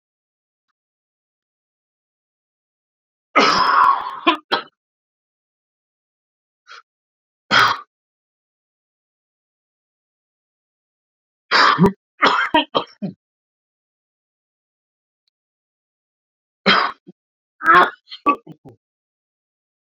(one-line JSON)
{"three_cough_length": "20.0 s", "three_cough_amplitude": 31689, "three_cough_signal_mean_std_ratio": 0.28, "survey_phase": "beta (2021-08-13 to 2022-03-07)", "age": "18-44", "gender": "Male", "wearing_mask": "No", "symptom_cough_any": true, "symptom_new_continuous_cough": true, "symptom_runny_or_blocked_nose": true, "symptom_shortness_of_breath": true, "symptom_fatigue": true, "symptom_other": true, "symptom_onset": "3 days", "smoker_status": "Ex-smoker", "respiratory_condition_asthma": false, "respiratory_condition_other": false, "recruitment_source": "Test and Trace", "submission_delay": "2 days", "covid_test_result": "Positive", "covid_test_method": "ePCR"}